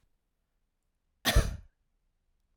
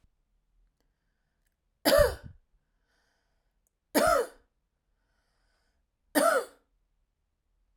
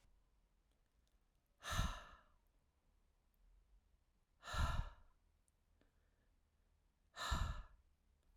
{"cough_length": "2.6 s", "cough_amplitude": 8332, "cough_signal_mean_std_ratio": 0.23, "three_cough_length": "7.8 s", "three_cough_amplitude": 11472, "three_cough_signal_mean_std_ratio": 0.27, "exhalation_length": "8.4 s", "exhalation_amplitude": 1507, "exhalation_signal_mean_std_ratio": 0.33, "survey_phase": "beta (2021-08-13 to 2022-03-07)", "age": "18-44", "gender": "Female", "wearing_mask": "No", "symptom_none": true, "smoker_status": "Never smoked", "respiratory_condition_asthma": false, "respiratory_condition_other": false, "recruitment_source": "REACT", "submission_delay": "1 day", "covid_test_result": "Negative", "covid_test_method": "RT-qPCR"}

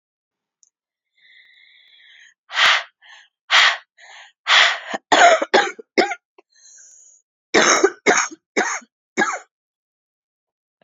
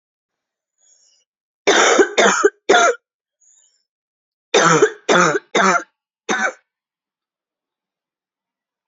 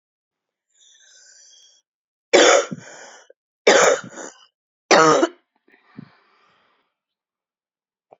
{"exhalation_length": "10.8 s", "exhalation_amplitude": 32614, "exhalation_signal_mean_std_ratio": 0.37, "cough_length": "8.9 s", "cough_amplitude": 32700, "cough_signal_mean_std_ratio": 0.4, "three_cough_length": "8.2 s", "three_cough_amplitude": 32168, "three_cough_signal_mean_std_ratio": 0.29, "survey_phase": "beta (2021-08-13 to 2022-03-07)", "age": "18-44", "gender": "Female", "wearing_mask": "No", "symptom_cough_any": true, "symptom_sore_throat": true, "symptom_fatigue": true, "symptom_fever_high_temperature": true, "symptom_headache": true, "symptom_other": true, "smoker_status": "Never smoked", "respiratory_condition_asthma": false, "respiratory_condition_other": false, "recruitment_source": "Test and Trace", "submission_delay": "1 day", "covid_test_result": "Positive", "covid_test_method": "RT-qPCR", "covid_ct_value": 21.9, "covid_ct_gene": "ORF1ab gene", "covid_ct_mean": 22.3, "covid_viral_load": "50000 copies/ml", "covid_viral_load_category": "Low viral load (10K-1M copies/ml)"}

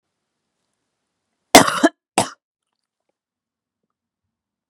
{"cough_length": "4.7 s", "cough_amplitude": 32768, "cough_signal_mean_std_ratio": 0.18, "survey_phase": "beta (2021-08-13 to 2022-03-07)", "age": "18-44", "gender": "Female", "wearing_mask": "No", "symptom_cough_any": true, "symptom_runny_or_blocked_nose": true, "symptom_sore_throat": true, "symptom_fatigue": true, "symptom_headache": true, "symptom_change_to_sense_of_smell_or_taste": true, "symptom_loss_of_taste": true, "symptom_onset": "3 days", "smoker_status": "Never smoked", "respiratory_condition_asthma": false, "respiratory_condition_other": false, "recruitment_source": "Test and Trace", "submission_delay": "2 days", "covid_test_result": "Positive", "covid_test_method": "RT-qPCR", "covid_ct_value": 29.7, "covid_ct_gene": "ORF1ab gene", "covid_ct_mean": 30.0, "covid_viral_load": "140 copies/ml", "covid_viral_load_category": "Minimal viral load (< 10K copies/ml)"}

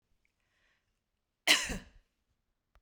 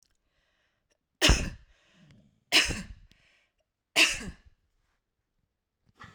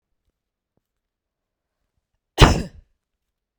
{"cough_length": "2.8 s", "cough_amplitude": 13736, "cough_signal_mean_std_ratio": 0.22, "three_cough_length": "6.1 s", "three_cough_amplitude": 14481, "three_cough_signal_mean_std_ratio": 0.27, "exhalation_length": "3.6 s", "exhalation_amplitude": 32768, "exhalation_signal_mean_std_ratio": 0.17, "survey_phase": "beta (2021-08-13 to 2022-03-07)", "age": "45-64", "gender": "Female", "wearing_mask": "No", "symptom_none": true, "smoker_status": "Never smoked", "respiratory_condition_asthma": false, "respiratory_condition_other": false, "recruitment_source": "REACT", "submission_delay": "2 days", "covid_test_result": "Negative", "covid_test_method": "RT-qPCR"}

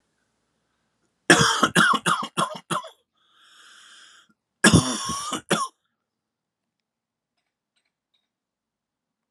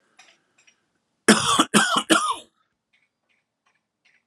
{"cough_length": "9.3 s", "cough_amplitude": 32480, "cough_signal_mean_std_ratio": 0.32, "three_cough_length": "4.3 s", "three_cough_amplitude": 30148, "three_cough_signal_mean_std_ratio": 0.34, "survey_phase": "alpha (2021-03-01 to 2021-08-12)", "age": "45-64", "gender": "Male", "wearing_mask": "No", "symptom_fatigue": true, "symptom_headache": true, "symptom_onset": "4 days", "smoker_status": "Current smoker (1 to 10 cigarettes per day)", "respiratory_condition_asthma": false, "respiratory_condition_other": false, "recruitment_source": "Test and Trace", "submission_delay": "3 days", "covid_test_result": "Positive", "covid_test_method": "RT-qPCR", "covid_ct_value": 14.9, "covid_ct_gene": "ORF1ab gene", "covid_ct_mean": 15.0, "covid_viral_load": "12000000 copies/ml", "covid_viral_load_category": "High viral load (>1M copies/ml)"}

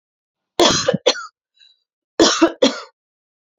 {"cough_length": "3.6 s", "cough_amplitude": 30861, "cough_signal_mean_std_ratio": 0.38, "survey_phase": "alpha (2021-03-01 to 2021-08-12)", "age": "45-64", "gender": "Female", "wearing_mask": "No", "symptom_none": true, "smoker_status": "Ex-smoker", "respiratory_condition_asthma": true, "respiratory_condition_other": false, "recruitment_source": "REACT", "submission_delay": "2 days", "covid_test_result": "Negative", "covid_test_method": "RT-qPCR"}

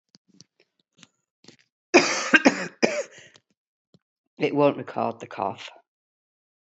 {"cough_length": "6.7 s", "cough_amplitude": 27266, "cough_signal_mean_std_ratio": 0.32, "survey_phase": "beta (2021-08-13 to 2022-03-07)", "age": "45-64", "gender": "Female", "wearing_mask": "No", "symptom_cough_any": true, "symptom_runny_or_blocked_nose": true, "symptom_sore_throat": true, "symptom_abdominal_pain": true, "symptom_fatigue": true, "symptom_onset": "5 days", "smoker_status": "Ex-smoker", "respiratory_condition_asthma": false, "respiratory_condition_other": false, "recruitment_source": "Test and Trace", "submission_delay": "2 days", "covid_test_result": "Positive", "covid_test_method": "RT-qPCR"}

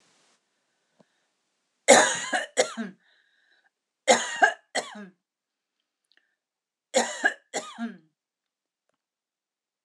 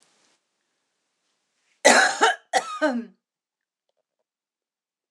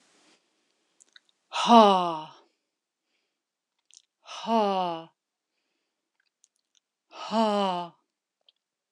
{"three_cough_length": "9.8 s", "three_cough_amplitude": 25584, "three_cough_signal_mean_std_ratio": 0.27, "cough_length": "5.1 s", "cough_amplitude": 26028, "cough_signal_mean_std_ratio": 0.29, "exhalation_length": "8.9 s", "exhalation_amplitude": 22096, "exhalation_signal_mean_std_ratio": 0.29, "survey_phase": "alpha (2021-03-01 to 2021-08-12)", "age": "45-64", "gender": "Female", "wearing_mask": "No", "symptom_none": true, "smoker_status": "Never smoked", "respiratory_condition_asthma": false, "respiratory_condition_other": false, "recruitment_source": "REACT", "submission_delay": "2 days", "covid_test_result": "Negative", "covid_test_method": "RT-qPCR"}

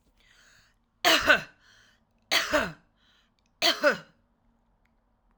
{"three_cough_length": "5.4 s", "three_cough_amplitude": 20552, "three_cough_signal_mean_std_ratio": 0.33, "survey_phase": "alpha (2021-03-01 to 2021-08-12)", "age": "45-64", "gender": "Female", "wearing_mask": "No", "symptom_none": true, "smoker_status": "Never smoked", "respiratory_condition_asthma": false, "respiratory_condition_other": false, "recruitment_source": "REACT", "submission_delay": "3 days", "covid_test_result": "Negative", "covid_test_method": "RT-qPCR"}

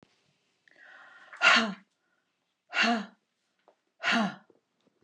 {"exhalation_length": "5.0 s", "exhalation_amplitude": 12083, "exhalation_signal_mean_std_ratio": 0.34, "survey_phase": "beta (2021-08-13 to 2022-03-07)", "age": "45-64", "gender": "Female", "wearing_mask": "No", "symptom_none": true, "smoker_status": "Never smoked", "respiratory_condition_asthma": true, "respiratory_condition_other": false, "recruitment_source": "REACT", "submission_delay": "0 days", "covid_test_result": "Negative", "covid_test_method": "RT-qPCR", "influenza_a_test_result": "Negative", "influenza_b_test_result": "Negative"}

